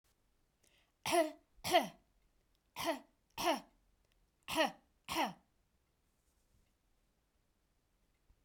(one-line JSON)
{"three_cough_length": "8.4 s", "three_cough_amplitude": 4571, "three_cough_signal_mean_std_ratio": 0.3, "survey_phase": "beta (2021-08-13 to 2022-03-07)", "age": "45-64", "gender": "Female", "wearing_mask": "No", "symptom_none": true, "smoker_status": "Never smoked", "respiratory_condition_asthma": false, "respiratory_condition_other": false, "recruitment_source": "REACT", "submission_delay": "2 days", "covid_test_result": "Negative", "covid_test_method": "RT-qPCR"}